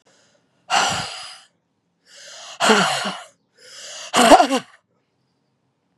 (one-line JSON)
{"exhalation_length": "6.0 s", "exhalation_amplitude": 32767, "exhalation_signal_mean_std_ratio": 0.36, "survey_phase": "beta (2021-08-13 to 2022-03-07)", "age": "45-64", "gender": "Female", "wearing_mask": "No", "symptom_cough_any": true, "symptom_runny_or_blocked_nose": true, "symptom_shortness_of_breath": true, "symptom_fatigue": true, "symptom_fever_high_temperature": true, "symptom_headache": true, "symptom_change_to_sense_of_smell_or_taste": true, "smoker_status": "Ex-smoker", "respiratory_condition_asthma": false, "respiratory_condition_other": false, "recruitment_source": "Test and Trace", "submission_delay": "2 days", "covid_test_result": "Positive", "covid_test_method": "LFT"}